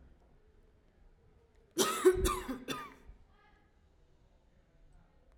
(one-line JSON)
{"cough_length": "5.4 s", "cough_amplitude": 6672, "cough_signal_mean_std_ratio": 0.31, "survey_phase": "alpha (2021-03-01 to 2021-08-12)", "age": "18-44", "gender": "Female", "wearing_mask": "No", "symptom_none": true, "symptom_onset": "13 days", "smoker_status": "Prefer not to say", "respiratory_condition_asthma": false, "respiratory_condition_other": false, "recruitment_source": "REACT", "submission_delay": "32 days", "covid_test_result": "Negative", "covid_test_method": "RT-qPCR"}